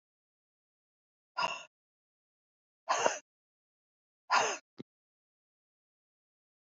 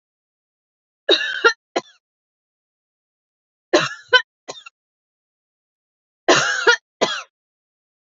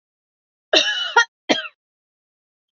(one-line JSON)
{"exhalation_length": "6.7 s", "exhalation_amplitude": 8467, "exhalation_signal_mean_std_ratio": 0.24, "three_cough_length": "8.1 s", "three_cough_amplitude": 28765, "three_cough_signal_mean_std_ratio": 0.28, "cough_length": "2.7 s", "cough_amplitude": 28601, "cough_signal_mean_std_ratio": 0.33, "survey_phase": "alpha (2021-03-01 to 2021-08-12)", "age": "65+", "gender": "Female", "wearing_mask": "No", "symptom_none": true, "smoker_status": "Ex-smoker", "respiratory_condition_asthma": false, "respiratory_condition_other": false, "recruitment_source": "REACT", "submission_delay": "2 days", "covid_test_result": "Negative", "covid_test_method": "RT-qPCR"}